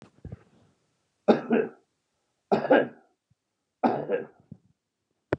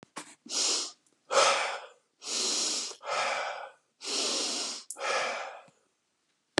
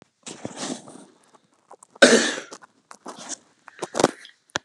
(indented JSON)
{
  "three_cough_length": "5.4 s",
  "three_cough_amplitude": 19594,
  "three_cough_signal_mean_std_ratio": 0.32,
  "exhalation_length": "6.6 s",
  "exhalation_amplitude": 17814,
  "exhalation_signal_mean_std_ratio": 0.62,
  "cough_length": "4.6 s",
  "cough_amplitude": 32767,
  "cough_signal_mean_std_ratio": 0.28,
  "survey_phase": "beta (2021-08-13 to 2022-03-07)",
  "age": "65+",
  "gender": "Male",
  "wearing_mask": "No",
  "symptom_runny_or_blocked_nose": true,
  "smoker_status": "Never smoked",
  "respiratory_condition_asthma": false,
  "respiratory_condition_other": false,
  "recruitment_source": "REACT",
  "submission_delay": "1 day",
  "covid_test_result": "Negative",
  "covid_test_method": "RT-qPCR",
  "influenza_a_test_result": "Unknown/Void",
  "influenza_b_test_result": "Unknown/Void"
}